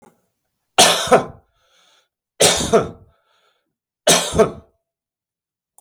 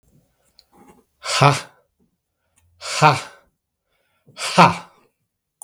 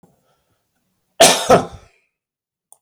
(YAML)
three_cough_length: 5.8 s
three_cough_amplitude: 32768
three_cough_signal_mean_std_ratio: 0.35
exhalation_length: 5.6 s
exhalation_amplitude: 32766
exhalation_signal_mean_std_ratio: 0.29
cough_length: 2.8 s
cough_amplitude: 32768
cough_signal_mean_std_ratio: 0.29
survey_phase: beta (2021-08-13 to 2022-03-07)
age: 65+
gender: Male
wearing_mask: 'No'
symptom_sore_throat: true
symptom_fatigue: true
symptom_onset: 4 days
smoker_status: Ex-smoker
respiratory_condition_asthma: false
respiratory_condition_other: false
recruitment_source: Test and Trace
submission_delay: 2 days
covid_test_result: Positive
covid_test_method: RT-qPCR
covid_ct_value: 17.7
covid_ct_gene: ORF1ab gene
covid_ct_mean: 18.1
covid_viral_load: 1200000 copies/ml
covid_viral_load_category: High viral load (>1M copies/ml)